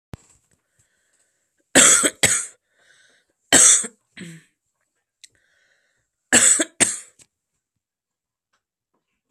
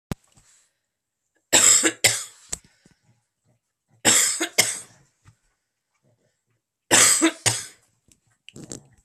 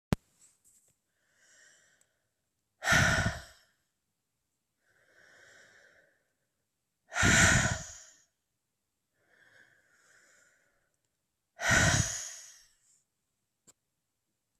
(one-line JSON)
{"cough_length": "9.3 s", "cough_amplitude": 32768, "cough_signal_mean_std_ratio": 0.29, "three_cough_length": "9.0 s", "three_cough_amplitude": 32524, "three_cough_signal_mean_std_ratio": 0.33, "exhalation_length": "14.6 s", "exhalation_amplitude": 13542, "exhalation_signal_mean_std_ratio": 0.28, "survey_phase": "alpha (2021-03-01 to 2021-08-12)", "age": "18-44", "gender": "Female", "wearing_mask": "No", "symptom_cough_any": true, "symptom_diarrhoea": true, "symptom_onset": "3 days", "smoker_status": "Ex-smoker", "respiratory_condition_asthma": false, "respiratory_condition_other": false, "recruitment_source": "REACT", "submission_delay": "2 days", "covid_test_result": "Negative", "covid_test_method": "RT-qPCR"}